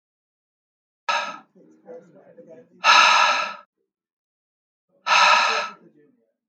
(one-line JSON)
{"exhalation_length": "6.5 s", "exhalation_amplitude": 25665, "exhalation_signal_mean_std_ratio": 0.38, "survey_phase": "alpha (2021-03-01 to 2021-08-12)", "age": "18-44", "gender": "Male", "wearing_mask": "No", "symptom_none": true, "smoker_status": "Never smoked", "respiratory_condition_asthma": false, "respiratory_condition_other": false, "recruitment_source": "REACT", "submission_delay": "2 days", "covid_test_result": "Negative", "covid_test_method": "RT-qPCR"}